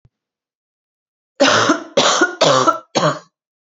three_cough_length: 3.7 s
three_cough_amplitude: 28441
three_cough_signal_mean_std_ratio: 0.5
survey_phase: beta (2021-08-13 to 2022-03-07)
age: 18-44
gender: Female
wearing_mask: 'No'
symptom_cough_any: true
symptom_new_continuous_cough: true
symptom_runny_or_blocked_nose: true
symptom_sore_throat: true
symptom_fatigue: true
symptom_onset: 3 days
smoker_status: Never smoked
respiratory_condition_asthma: false
respiratory_condition_other: false
recruitment_source: Test and Trace
submission_delay: 1 day
covid_test_result: Negative
covid_test_method: RT-qPCR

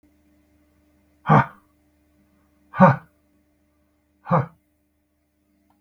exhalation_length: 5.8 s
exhalation_amplitude: 32768
exhalation_signal_mean_std_ratio: 0.23
survey_phase: beta (2021-08-13 to 2022-03-07)
age: 45-64
gender: Male
wearing_mask: 'No'
symptom_none: true
smoker_status: Never smoked
respiratory_condition_asthma: false
respiratory_condition_other: false
recruitment_source: REACT
submission_delay: 2 days
covid_test_result: Negative
covid_test_method: RT-qPCR
influenza_a_test_result: Negative
influenza_b_test_result: Negative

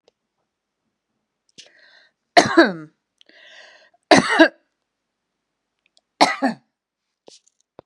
three_cough_length: 7.9 s
three_cough_amplitude: 32768
three_cough_signal_mean_std_ratio: 0.24
survey_phase: beta (2021-08-13 to 2022-03-07)
age: 65+
gender: Female
wearing_mask: 'No'
symptom_none: true
smoker_status: Never smoked
respiratory_condition_asthma: false
respiratory_condition_other: false
recruitment_source: REACT
submission_delay: 1 day
covid_test_result: Negative
covid_test_method: RT-qPCR
influenza_a_test_result: Negative
influenza_b_test_result: Negative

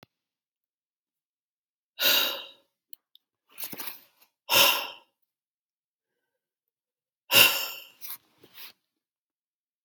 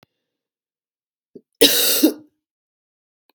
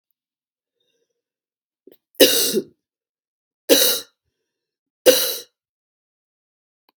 exhalation_length: 9.8 s
exhalation_amplitude: 28955
exhalation_signal_mean_std_ratio: 0.27
cough_length: 3.3 s
cough_amplitude: 32768
cough_signal_mean_std_ratio: 0.3
three_cough_length: 7.0 s
three_cough_amplitude: 32768
three_cough_signal_mean_std_ratio: 0.27
survey_phase: beta (2021-08-13 to 2022-03-07)
age: 45-64
gender: Female
wearing_mask: 'No'
symptom_cough_any: true
symptom_new_continuous_cough: true
symptom_runny_or_blocked_nose: true
symptom_shortness_of_breath: true
symptom_diarrhoea: true
symptom_fatigue: true
symptom_fever_high_temperature: true
symptom_headache: true
symptom_other: true
symptom_onset: 2 days
smoker_status: Never smoked
respiratory_condition_asthma: false
respiratory_condition_other: false
recruitment_source: Test and Trace
submission_delay: 2 days
covid_test_result: Positive
covid_test_method: RT-qPCR
covid_ct_value: 17.1
covid_ct_gene: ORF1ab gene
covid_ct_mean: 17.3
covid_viral_load: 2100000 copies/ml
covid_viral_load_category: High viral load (>1M copies/ml)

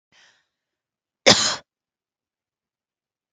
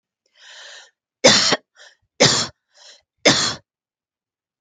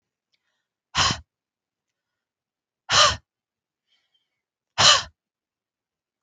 cough_length: 3.3 s
cough_amplitude: 32768
cough_signal_mean_std_ratio: 0.2
three_cough_length: 4.6 s
three_cough_amplitude: 32768
three_cough_signal_mean_std_ratio: 0.33
exhalation_length: 6.2 s
exhalation_amplitude: 31915
exhalation_signal_mean_std_ratio: 0.25
survey_phase: beta (2021-08-13 to 2022-03-07)
age: 45-64
gender: Female
wearing_mask: 'No'
symptom_none: true
symptom_onset: 12 days
smoker_status: Never smoked
respiratory_condition_asthma: false
respiratory_condition_other: false
recruitment_source: REACT
submission_delay: 2 days
covid_test_result: Negative
covid_test_method: RT-qPCR
influenza_a_test_result: Negative
influenza_b_test_result: Negative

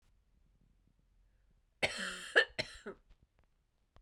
cough_length: 4.0 s
cough_amplitude: 8323
cough_signal_mean_std_ratio: 0.25
survey_phase: beta (2021-08-13 to 2022-03-07)
age: 18-44
gender: Female
wearing_mask: 'No'
symptom_cough_any: true
symptom_runny_or_blocked_nose: true
symptom_shortness_of_breath: true
symptom_sore_throat: true
symptom_fatigue: true
symptom_headache: true
symptom_onset: 12 days
smoker_status: Never smoked
respiratory_condition_asthma: false
respiratory_condition_other: false
recruitment_source: REACT
submission_delay: 3 days
covid_test_result: Negative
covid_test_method: RT-qPCR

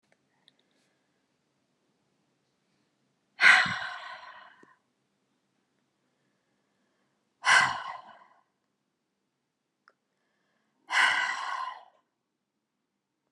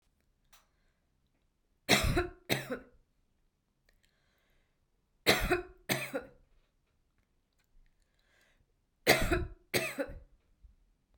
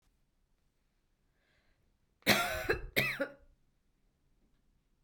exhalation_length: 13.3 s
exhalation_amplitude: 17983
exhalation_signal_mean_std_ratio: 0.25
three_cough_length: 11.2 s
three_cough_amplitude: 12589
three_cough_signal_mean_std_ratio: 0.31
cough_length: 5.0 s
cough_amplitude: 9139
cough_signal_mean_std_ratio: 0.3
survey_phase: beta (2021-08-13 to 2022-03-07)
age: 45-64
gender: Female
wearing_mask: 'No'
symptom_none: true
smoker_status: Ex-smoker
respiratory_condition_asthma: false
respiratory_condition_other: false
recruitment_source: REACT
submission_delay: 1 day
covid_test_result: Negative
covid_test_method: RT-qPCR
influenza_a_test_result: Negative
influenza_b_test_result: Negative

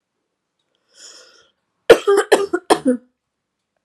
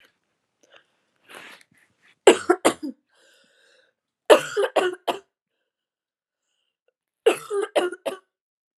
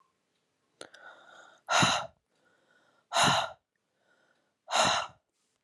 cough_length: 3.8 s
cough_amplitude: 32768
cough_signal_mean_std_ratio: 0.3
three_cough_length: 8.8 s
three_cough_amplitude: 31996
three_cough_signal_mean_std_ratio: 0.26
exhalation_length: 5.6 s
exhalation_amplitude: 10825
exhalation_signal_mean_std_ratio: 0.36
survey_phase: beta (2021-08-13 to 2022-03-07)
age: 18-44
gender: Female
wearing_mask: 'Yes'
symptom_fatigue: true
symptom_headache: true
smoker_status: Never smoked
respiratory_condition_asthma: false
respiratory_condition_other: false
recruitment_source: Test and Trace
submission_delay: 2 days
covid_test_result: Positive
covid_test_method: RT-qPCR
covid_ct_value: 25.9
covid_ct_gene: ORF1ab gene
covid_ct_mean: 26.9
covid_viral_load: 1500 copies/ml
covid_viral_load_category: Minimal viral load (< 10K copies/ml)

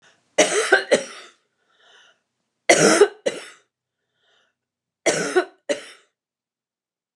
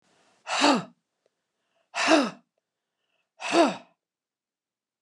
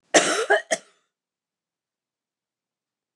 three_cough_length: 7.2 s
three_cough_amplitude: 29185
three_cough_signal_mean_std_ratio: 0.33
exhalation_length: 5.0 s
exhalation_amplitude: 16821
exhalation_signal_mean_std_ratio: 0.33
cough_length: 3.2 s
cough_amplitude: 27640
cough_signal_mean_std_ratio: 0.28
survey_phase: alpha (2021-03-01 to 2021-08-12)
age: 65+
gender: Female
wearing_mask: 'No'
symptom_none: true
smoker_status: Ex-smoker
respiratory_condition_asthma: false
respiratory_condition_other: false
recruitment_source: REACT
submission_delay: 3 days
covid_test_result: Negative
covid_test_method: RT-qPCR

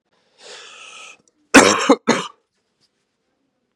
cough_length: 3.8 s
cough_amplitude: 32768
cough_signal_mean_std_ratio: 0.28
survey_phase: beta (2021-08-13 to 2022-03-07)
age: 18-44
gender: Male
wearing_mask: 'No'
symptom_cough_any: true
symptom_new_continuous_cough: true
symptom_runny_or_blocked_nose: true
symptom_other: true
symptom_onset: 3 days
smoker_status: Never smoked
respiratory_condition_asthma: false
respiratory_condition_other: false
recruitment_source: Test and Trace
submission_delay: 2 days
covid_test_result: Positive
covid_test_method: RT-qPCR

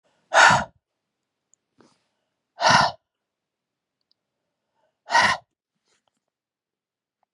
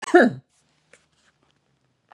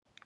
exhalation_length: 7.3 s
exhalation_amplitude: 25978
exhalation_signal_mean_std_ratio: 0.26
cough_length: 2.1 s
cough_amplitude: 26523
cough_signal_mean_std_ratio: 0.25
three_cough_length: 0.3 s
three_cough_amplitude: 618
three_cough_signal_mean_std_ratio: 0.36
survey_phase: beta (2021-08-13 to 2022-03-07)
age: 45-64
gender: Female
wearing_mask: 'No'
symptom_none: true
symptom_onset: 8 days
smoker_status: Never smoked
respiratory_condition_asthma: false
respiratory_condition_other: false
recruitment_source: REACT
submission_delay: 1 day
covid_test_result: Negative
covid_test_method: RT-qPCR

